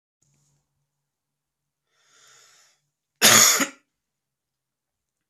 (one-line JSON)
{"cough_length": "5.3 s", "cough_amplitude": 30939, "cough_signal_mean_std_ratio": 0.22, "survey_phase": "beta (2021-08-13 to 2022-03-07)", "age": "18-44", "gender": "Male", "wearing_mask": "No", "symptom_cough_any": true, "symptom_new_continuous_cough": true, "symptom_runny_or_blocked_nose": true, "symptom_sore_throat": true, "symptom_fatigue": true, "symptom_fever_high_temperature": true, "symptom_other": true, "symptom_onset": "2 days", "smoker_status": "Ex-smoker", "respiratory_condition_asthma": false, "respiratory_condition_other": false, "recruitment_source": "Test and Trace", "submission_delay": "1 day", "covid_test_result": "Positive", "covid_test_method": "RT-qPCR", "covid_ct_value": 20.3, "covid_ct_gene": "ORF1ab gene"}